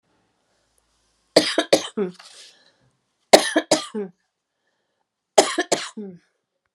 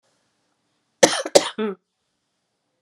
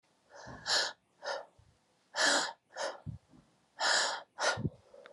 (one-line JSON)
{"three_cough_length": "6.7 s", "three_cough_amplitude": 32768, "three_cough_signal_mean_std_ratio": 0.28, "cough_length": "2.8 s", "cough_amplitude": 32768, "cough_signal_mean_std_ratio": 0.24, "exhalation_length": "5.1 s", "exhalation_amplitude": 5836, "exhalation_signal_mean_std_ratio": 0.49, "survey_phase": "beta (2021-08-13 to 2022-03-07)", "age": "45-64", "gender": "Female", "wearing_mask": "No", "symptom_cough_any": true, "symptom_runny_or_blocked_nose": true, "symptom_shortness_of_breath": true, "symptom_sore_throat": true, "symptom_fatigue": true, "symptom_change_to_sense_of_smell_or_taste": true, "symptom_loss_of_taste": true, "smoker_status": "Never smoked", "respiratory_condition_asthma": true, "respiratory_condition_other": false, "recruitment_source": "Test and Trace", "submission_delay": "1 day", "covid_test_result": "Positive", "covid_test_method": "RT-qPCR", "covid_ct_value": 23.3, "covid_ct_gene": "ORF1ab gene", "covid_ct_mean": 24.0, "covid_viral_load": "14000 copies/ml", "covid_viral_load_category": "Low viral load (10K-1M copies/ml)"}